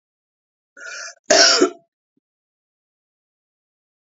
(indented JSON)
{
  "cough_length": "4.0 s",
  "cough_amplitude": 32767,
  "cough_signal_mean_std_ratio": 0.27,
  "survey_phase": "beta (2021-08-13 to 2022-03-07)",
  "age": "45-64",
  "gender": "Female",
  "wearing_mask": "No",
  "symptom_none": true,
  "symptom_onset": "12 days",
  "smoker_status": "Never smoked",
  "respiratory_condition_asthma": false,
  "respiratory_condition_other": false,
  "recruitment_source": "REACT",
  "submission_delay": "2 days",
  "covid_test_result": "Negative",
  "covid_test_method": "RT-qPCR"
}